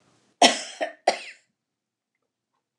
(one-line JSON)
{"cough_length": "2.8 s", "cough_amplitude": 25942, "cough_signal_mean_std_ratio": 0.24, "survey_phase": "beta (2021-08-13 to 2022-03-07)", "age": "65+", "gender": "Female", "wearing_mask": "No", "symptom_abdominal_pain": true, "symptom_onset": "12 days", "smoker_status": "Ex-smoker", "respiratory_condition_asthma": false, "respiratory_condition_other": false, "recruitment_source": "REACT", "submission_delay": "2 days", "covid_test_result": "Negative", "covid_test_method": "RT-qPCR", "influenza_a_test_result": "Negative", "influenza_b_test_result": "Negative"}